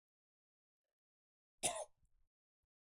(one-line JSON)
{"cough_length": "2.9 s", "cough_amplitude": 1987, "cough_signal_mean_std_ratio": 0.2, "survey_phase": "beta (2021-08-13 to 2022-03-07)", "age": "45-64", "gender": "Male", "wearing_mask": "Yes", "symptom_cough_any": true, "symptom_runny_or_blocked_nose": true, "symptom_sore_throat": true, "symptom_headache": true, "symptom_change_to_sense_of_smell_or_taste": true, "symptom_onset": "5 days", "smoker_status": "Never smoked", "respiratory_condition_asthma": false, "respiratory_condition_other": false, "recruitment_source": "Test and Trace", "submission_delay": "2 days", "covid_test_result": "Positive", "covid_test_method": "RT-qPCR"}